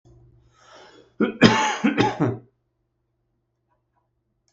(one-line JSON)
{"cough_length": "4.5 s", "cough_amplitude": 32768, "cough_signal_mean_std_ratio": 0.34, "survey_phase": "beta (2021-08-13 to 2022-03-07)", "age": "45-64", "gender": "Male", "wearing_mask": "No", "symptom_none": true, "smoker_status": "Ex-smoker", "respiratory_condition_asthma": true, "respiratory_condition_other": false, "recruitment_source": "REACT", "submission_delay": "2 days", "covid_test_result": "Negative", "covid_test_method": "RT-qPCR", "influenza_a_test_result": "Negative", "influenza_b_test_result": "Negative"}